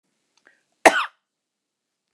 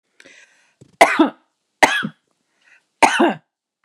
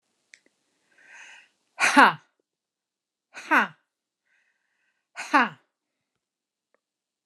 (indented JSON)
{
  "cough_length": "2.1 s",
  "cough_amplitude": 29204,
  "cough_signal_mean_std_ratio": 0.18,
  "three_cough_length": "3.8 s",
  "three_cough_amplitude": 29204,
  "three_cough_signal_mean_std_ratio": 0.32,
  "exhalation_length": "7.3 s",
  "exhalation_amplitude": 29203,
  "exhalation_signal_mean_std_ratio": 0.21,
  "survey_phase": "alpha (2021-03-01 to 2021-08-12)",
  "age": "45-64",
  "gender": "Female",
  "wearing_mask": "No",
  "symptom_none": true,
  "smoker_status": "Never smoked",
  "respiratory_condition_asthma": false,
  "respiratory_condition_other": false,
  "recruitment_source": "REACT",
  "submission_delay": "2 days",
  "covid_test_result": "Negative",
  "covid_test_method": "RT-qPCR"
}